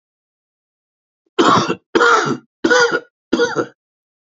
{"cough_length": "4.3 s", "cough_amplitude": 30746, "cough_signal_mean_std_ratio": 0.46, "survey_phase": "alpha (2021-03-01 to 2021-08-12)", "age": "65+", "gender": "Male", "wearing_mask": "No", "symptom_none": true, "smoker_status": "Never smoked", "respiratory_condition_asthma": false, "respiratory_condition_other": false, "recruitment_source": "REACT", "submission_delay": "3 days", "covid_test_result": "Negative", "covid_test_method": "RT-qPCR"}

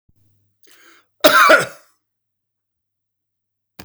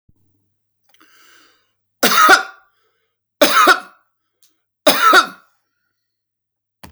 {"cough_length": "3.8 s", "cough_amplitude": 32768, "cough_signal_mean_std_ratio": 0.27, "three_cough_length": "6.9 s", "three_cough_amplitude": 32767, "three_cough_signal_mean_std_ratio": 0.33, "survey_phase": "beta (2021-08-13 to 2022-03-07)", "age": "65+", "gender": "Male", "wearing_mask": "No", "symptom_diarrhoea": true, "symptom_fatigue": true, "smoker_status": "Ex-smoker", "respiratory_condition_asthma": false, "respiratory_condition_other": false, "recruitment_source": "REACT", "submission_delay": "2 days", "covid_test_result": "Negative", "covid_test_method": "RT-qPCR", "influenza_a_test_result": "Negative", "influenza_b_test_result": "Negative"}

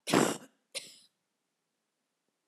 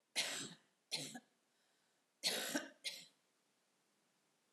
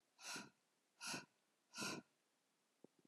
{"cough_length": "2.5 s", "cough_amplitude": 9611, "cough_signal_mean_std_ratio": 0.26, "three_cough_length": "4.5 s", "three_cough_amplitude": 2448, "three_cough_signal_mean_std_ratio": 0.39, "exhalation_length": "3.1 s", "exhalation_amplitude": 619, "exhalation_signal_mean_std_ratio": 0.42, "survey_phase": "beta (2021-08-13 to 2022-03-07)", "age": "65+", "gender": "Female", "wearing_mask": "No", "symptom_none": true, "smoker_status": "Never smoked", "respiratory_condition_asthma": false, "respiratory_condition_other": false, "recruitment_source": "REACT", "submission_delay": "2 days", "covid_test_result": "Negative", "covid_test_method": "RT-qPCR"}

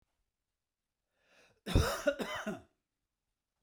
{"cough_length": "3.6 s", "cough_amplitude": 5037, "cough_signal_mean_std_ratio": 0.32, "survey_phase": "beta (2021-08-13 to 2022-03-07)", "age": "45-64", "gender": "Male", "wearing_mask": "No", "symptom_none": true, "smoker_status": "Never smoked", "respiratory_condition_asthma": false, "respiratory_condition_other": false, "recruitment_source": "REACT", "submission_delay": "1 day", "covid_test_result": "Negative", "covid_test_method": "RT-qPCR"}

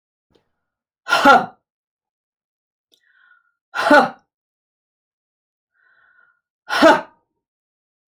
{"exhalation_length": "8.1 s", "exhalation_amplitude": 30449, "exhalation_signal_mean_std_ratio": 0.26, "survey_phase": "alpha (2021-03-01 to 2021-08-12)", "age": "45-64", "gender": "Female", "wearing_mask": "No", "symptom_none": true, "smoker_status": "Never smoked", "respiratory_condition_asthma": true, "respiratory_condition_other": false, "recruitment_source": "REACT", "submission_delay": "2 days", "covid_test_result": "Negative", "covid_test_method": "RT-qPCR"}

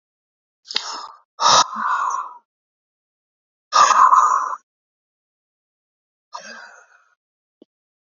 {"exhalation_length": "8.0 s", "exhalation_amplitude": 27736, "exhalation_signal_mean_std_ratio": 0.35, "survey_phase": "beta (2021-08-13 to 2022-03-07)", "age": "45-64", "gender": "Male", "wearing_mask": "No", "symptom_cough_any": true, "symptom_runny_or_blocked_nose": true, "symptom_onset": "12 days", "smoker_status": "Ex-smoker", "respiratory_condition_asthma": false, "respiratory_condition_other": false, "recruitment_source": "REACT", "submission_delay": "1 day", "covid_test_result": "Negative", "covid_test_method": "RT-qPCR", "influenza_a_test_result": "Negative", "influenza_b_test_result": "Negative"}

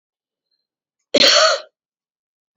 {"cough_length": "2.6 s", "cough_amplitude": 31248, "cough_signal_mean_std_ratio": 0.33, "survey_phase": "beta (2021-08-13 to 2022-03-07)", "age": "45-64", "gender": "Female", "wearing_mask": "No", "symptom_none": true, "smoker_status": "Current smoker (e-cigarettes or vapes only)", "respiratory_condition_asthma": true, "respiratory_condition_other": false, "recruitment_source": "REACT", "submission_delay": "3 days", "covid_test_result": "Negative", "covid_test_method": "RT-qPCR", "influenza_a_test_result": "Negative", "influenza_b_test_result": "Negative"}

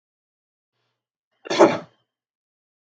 {"cough_length": "2.8 s", "cough_amplitude": 32470, "cough_signal_mean_std_ratio": 0.21, "survey_phase": "beta (2021-08-13 to 2022-03-07)", "age": "45-64", "gender": "Male", "wearing_mask": "No", "symptom_none": true, "smoker_status": "Never smoked", "respiratory_condition_asthma": false, "respiratory_condition_other": false, "recruitment_source": "REACT", "submission_delay": "1 day", "covid_test_result": "Negative", "covid_test_method": "RT-qPCR", "influenza_a_test_result": "Negative", "influenza_b_test_result": "Negative"}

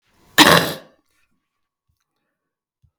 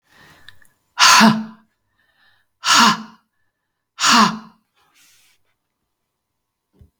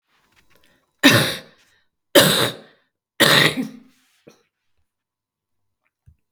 {"cough_length": "3.0 s", "cough_amplitude": 32768, "cough_signal_mean_std_ratio": 0.25, "exhalation_length": "7.0 s", "exhalation_amplitude": 32768, "exhalation_signal_mean_std_ratio": 0.32, "three_cough_length": "6.3 s", "three_cough_amplitude": 32768, "three_cough_signal_mean_std_ratio": 0.32, "survey_phase": "beta (2021-08-13 to 2022-03-07)", "age": "45-64", "gender": "Female", "wearing_mask": "No", "symptom_cough_any": true, "symptom_runny_or_blocked_nose": true, "symptom_fatigue": true, "symptom_headache": true, "symptom_change_to_sense_of_smell_or_taste": true, "symptom_onset": "6 days", "smoker_status": "Never smoked", "respiratory_condition_asthma": false, "respiratory_condition_other": false, "recruitment_source": "Test and Trace", "submission_delay": "2 days", "covid_test_result": "Positive", "covid_test_method": "ePCR"}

